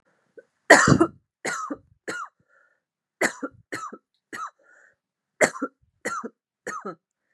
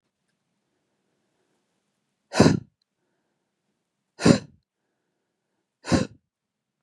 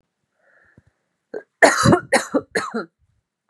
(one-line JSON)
{"three_cough_length": "7.3 s", "three_cough_amplitude": 32669, "three_cough_signal_mean_std_ratio": 0.28, "exhalation_length": "6.8 s", "exhalation_amplitude": 32345, "exhalation_signal_mean_std_ratio": 0.2, "cough_length": "3.5 s", "cough_amplitude": 32598, "cough_signal_mean_std_ratio": 0.34, "survey_phase": "beta (2021-08-13 to 2022-03-07)", "age": "18-44", "gender": "Female", "wearing_mask": "No", "symptom_runny_or_blocked_nose": true, "smoker_status": "Ex-smoker", "respiratory_condition_asthma": true, "respiratory_condition_other": false, "recruitment_source": "REACT", "submission_delay": "1 day", "covid_test_result": "Negative", "covid_test_method": "RT-qPCR", "influenza_a_test_result": "Unknown/Void", "influenza_b_test_result": "Unknown/Void"}